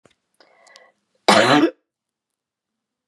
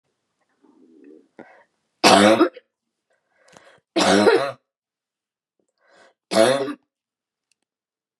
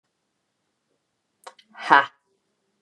{"cough_length": "3.1 s", "cough_amplitude": 32199, "cough_signal_mean_std_ratio": 0.3, "three_cough_length": "8.2 s", "three_cough_amplitude": 32767, "three_cough_signal_mean_std_ratio": 0.32, "exhalation_length": "2.8 s", "exhalation_amplitude": 32419, "exhalation_signal_mean_std_ratio": 0.17, "survey_phase": "beta (2021-08-13 to 2022-03-07)", "age": "45-64", "gender": "Female", "wearing_mask": "No", "symptom_cough_any": true, "symptom_new_continuous_cough": true, "symptom_onset": "3 days", "smoker_status": "Never smoked", "respiratory_condition_asthma": false, "respiratory_condition_other": false, "recruitment_source": "Test and Trace", "submission_delay": "2 days", "covid_test_result": "Positive", "covid_test_method": "RT-qPCR", "covid_ct_value": 27.5, "covid_ct_gene": "N gene", "covid_ct_mean": 27.9, "covid_viral_load": "710 copies/ml", "covid_viral_load_category": "Minimal viral load (< 10K copies/ml)"}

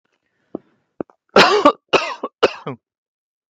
{"three_cough_length": "3.5 s", "three_cough_amplitude": 32768, "three_cough_signal_mean_std_ratio": 0.32, "survey_phase": "beta (2021-08-13 to 2022-03-07)", "age": "45-64", "gender": "Male", "wearing_mask": "Yes", "symptom_none": true, "smoker_status": "Never smoked", "respiratory_condition_asthma": false, "respiratory_condition_other": false, "recruitment_source": "REACT", "submission_delay": "3 days", "covid_test_result": "Negative", "covid_test_method": "RT-qPCR", "influenza_a_test_result": "Negative", "influenza_b_test_result": "Negative"}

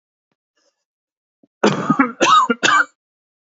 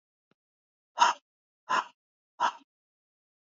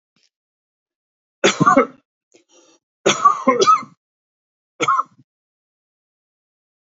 {"cough_length": "3.6 s", "cough_amplitude": 29082, "cough_signal_mean_std_ratio": 0.41, "exhalation_length": "3.4 s", "exhalation_amplitude": 12639, "exhalation_signal_mean_std_ratio": 0.26, "three_cough_length": "7.0 s", "three_cough_amplitude": 28757, "three_cough_signal_mean_std_ratio": 0.32, "survey_phase": "beta (2021-08-13 to 2022-03-07)", "age": "45-64", "gender": "Male", "wearing_mask": "No", "symptom_none": true, "symptom_onset": "10 days", "smoker_status": "Never smoked", "respiratory_condition_asthma": false, "respiratory_condition_other": false, "recruitment_source": "REACT", "submission_delay": "2 days", "covid_test_result": "Negative", "covid_test_method": "RT-qPCR"}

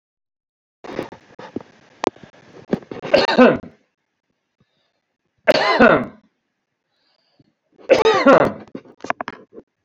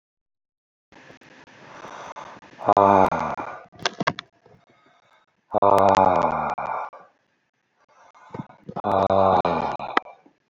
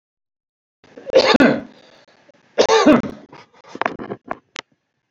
{"three_cough_length": "9.8 s", "three_cough_amplitude": 32767, "three_cough_signal_mean_std_ratio": 0.33, "exhalation_length": "10.5 s", "exhalation_amplitude": 26936, "exhalation_signal_mean_std_ratio": 0.4, "cough_length": "5.1 s", "cough_amplitude": 31455, "cough_signal_mean_std_ratio": 0.36, "survey_phase": "beta (2021-08-13 to 2022-03-07)", "age": "65+", "gender": "Male", "wearing_mask": "No", "symptom_fatigue": true, "smoker_status": "Ex-smoker", "respiratory_condition_asthma": false, "respiratory_condition_other": false, "recruitment_source": "REACT", "submission_delay": "2 days", "covid_test_result": "Negative", "covid_test_method": "RT-qPCR", "influenza_a_test_result": "Negative", "influenza_b_test_result": "Negative"}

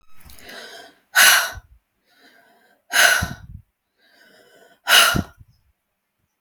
{"exhalation_length": "6.4 s", "exhalation_amplitude": 32767, "exhalation_signal_mean_std_ratio": 0.33, "survey_phase": "beta (2021-08-13 to 2022-03-07)", "age": "18-44", "gender": "Female", "wearing_mask": "No", "symptom_none": true, "smoker_status": "Never smoked", "respiratory_condition_asthma": true, "respiratory_condition_other": false, "recruitment_source": "REACT", "submission_delay": "5 days", "covid_test_result": "Negative", "covid_test_method": "RT-qPCR"}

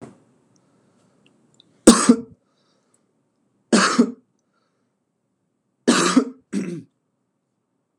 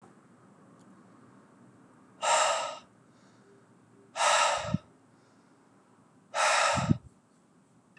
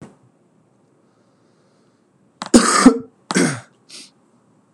{"three_cough_length": "8.0 s", "three_cough_amplitude": 32768, "three_cough_signal_mean_std_ratio": 0.27, "exhalation_length": "8.0 s", "exhalation_amplitude": 9998, "exhalation_signal_mean_std_ratio": 0.4, "cough_length": "4.7 s", "cough_amplitude": 32768, "cough_signal_mean_std_ratio": 0.28, "survey_phase": "beta (2021-08-13 to 2022-03-07)", "age": "18-44", "gender": "Male", "wearing_mask": "No", "symptom_cough_any": true, "symptom_runny_or_blocked_nose": true, "symptom_sore_throat": true, "symptom_fatigue": true, "symptom_headache": true, "symptom_onset": "3 days", "smoker_status": "Never smoked", "respiratory_condition_asthma": false, "respiratory_condition_other": false, "recruitment_source": "Test and Trace", "submission_delay": "1 day", "covid_test_result": "Positive", "covid_test_method": "RT-qPCR", "covid_ct_value": 24.8, "covid_ct_gene": "N gene"}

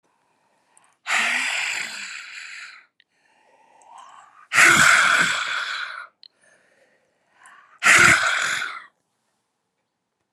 {"exhalation_length": "10.3 s", "exhalation_amplitude": 29110, "exhalation_signal_mean_std_ratio": 0.42, "survey_phase": "alpha (2021-03-01 to 2021-08-12)", "age": "65+", "gender": "Female", "wearing_mask": "No", "symptom_shortness_of_breath": true, "smoker_status": "Never smoked", "respiratory_condition_asthma": true, "respiratory_condition_other": false, "recruitment_source": "REACT", "submission_delay": "20 days", "covid_test_result": "Negative", "covid_test_method": "RT-qPCR"}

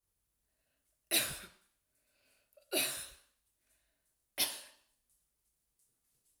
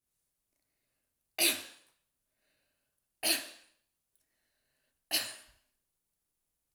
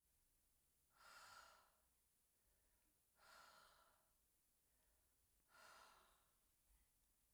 {"cough_length": "6.4 s", "cough_amplitude": 4689, "cough_signal_mean_std_ratio": 0.27, "three_cough_length": "6.7 s", "three_cough_amplitude": 6476, "three_cough_signal_mean_std_ratio": 0.23, "exhalation_length": "7.3 s", "exhalation_amplitude": 76, "exhalation_signal_mean_std_ratio": 0.68, "survey_phase": "alpha (2021-03-01 to 2021-08-12)", "age": "45-64", "gender": "Female", "wearing_mask": "No", "symptom_none": true, "smoker_status": "Never smoked", "respiratory_condition_asthma": false, "respiratory_condition_other": false, "recruitment_source": "REACT", "submission_delay": "2 days", "covid_test_result": "Negative", "covid_test_method": "RT-qPCR"}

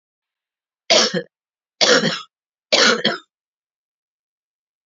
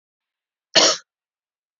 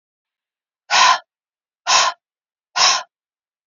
{"three_cough_length": "4.9 s", "three_cough_amplitude": 32560, "three_cough_signal_mean_std_ratio": 0.36, "cough_length": "1.8 s", "cough_amplitude": 28442, "cough_signal_mean_std_ratio": 0.26, "exhalation_length": "3.7 s", "exhalation_amplitude": 28957, "exhalation_signal_mean_std_ratio": 0.37, "survey_phase": "beta (2021-08-13 to 2022-03-07)", "age": "45-64", "gender": "Female", "wearing_mask": "No", "symptom_cough_any": true, "symptom_runny_or_blocked_nose": true, "symptom_sore_throat": true, "symptom_change_to_sense_of_smell_or_taste": true, "symptom_loss_of_taste": true, "smoker_status": "Never smoked", "respiratory_condition_asthma": false, "respiratory_condition_other": false, "recruitment_source": "Test and Trace", "submission_delay": "2 days", "covid_test_result": "Positive", "covid_test_method": "RT-qPCR", "covid_ct_value": 26.5, "covid_ct_gene": "ORF1ab gene", "covid_ct_mean": 27.0, "covid_viral_load": "1400 copies/ml", "covid_viral_load_category": "Minimal viral load (< 10K copies/ml)"}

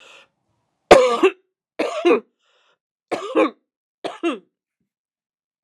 {"three_cough_length": "5.6 s", "three_cough_amplitude": 32768, "three_cough_signal_mean_std_ratio": 0.32, "survey_phase": "alpha (2021-03-01 to 2021-08-12)", "age": "45-64", "gender": "Female", "wearing_mask": "No", "symptom_cough_any": true, "symptom_fatigue": true, "symptom_headache": true, "symptom_onset": "5 days", "smoker_status": "Ex-smoker", "respiratory_condition_asthma": false, "respiratory_condition_other": false, "recruitment_source": "Test and Trace", "submission_delay": "1 day", "covid_test_result": "Positive", "covid_test_method": "RT-qPCR", "covid_ct_value": 12.0, "covid_ct_gene": "ORF1ab gene", "covid_ct_mean": 12.3, "covid_viral_load": "92000000 copies/ml", "covid_viral_load_category": "High viral load (>1M copies/ml)"}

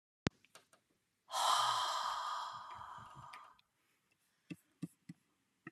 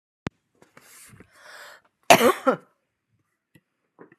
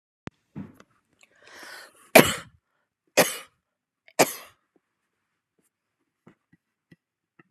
{"exhalation_length": "5.7 s", "exhalation_amplitude": 5661, "exhalation_signal_mean_std_ratio": 0.43, "cough_length": "4.2 s", "cough_amplitude": 32768, "cough_signal_mean_std_ratio": 0.22, "three_cough_length": "7.5 s", "three_cough_amplitude": 32729, "three_cough_signal_mean_std_ratio": 0.17, "survey_phase": "beta (2021-08-13 to 2022-03-07)", "age": "65+", "gender": "Female", "wearing_mask": "No", "symptom_none": true, "smoker_status": "Ex-smoker", "respiratory_condition_asthma": false, "respiratory_condition_other": false, "recruitment_source": "REACT", "submission_delay": "2 days", "covid_test_result": "Negative", "covid_test_method": "RT-qPCR"}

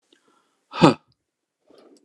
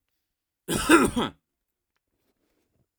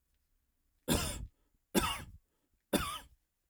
{"exhalation_length": "2.0 s", "exhalation_amplitude": 29204, "exhalation_signal_mean_std_ratio": 0.2, "cough_length": "3.0 s", "cough_amplitude": 20996, "cough_signal_mean_std_ratio": 0.3, "three_cough_length": "3.5 s", "three_cough_amplitude": 6199, "three_cough_signal_mean_std_ratio": 0.37, "survey_phase": "alpha (2021-03-01 to 2021-08-12)", "age": "45-64", "gender": "Male", "wearing_mask": "No", "symptom_none": true, "smoker_status": "Never smoked", "respiratory_condition_asthma": false, "respiratory_condition_other": false, "recruitment_source": "REACT", "submission_delay": "2 days", "covid_test_result": "Negative", "covid_test_method": "RT-qPCR"}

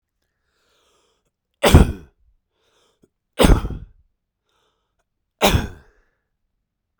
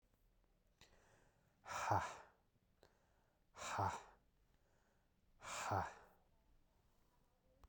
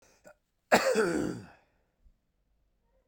{"three_cough_length": "7.0 s", "three_cough_amplitude": 32768, "three_cough_signal_mean_std_ratio": 0.24, "exhalation_length": "7.7 s", "exhalation_amplitude": 1773, "exhalation_signal_mean_std_ratio": 0.35, "cough_length": "3.1 s", "cough_amplitude": 13201, "cough_signal_mean_std_ratio": 0.35, "survey_phase": "beta (2021-08-13 to 2022-03-07)", "age": "45-64", "gender": "Male", "wearing_mask": "No", "symptom_cough_any": true, "symptom_runny_or_blocked_nose": true, "smoker_status": "Ex-smoker", "respiratory_condition_asthma": false, "respiratory_condition_other": true, "recruitment_source": "Test and Trace", "submission_delay": "2 days", "covid_test_result": "Positive", "covid_test_method": "RT-qPCR", "covid_ct_value": 22.4, "covid_ct_gene": "ORF1ab gene"}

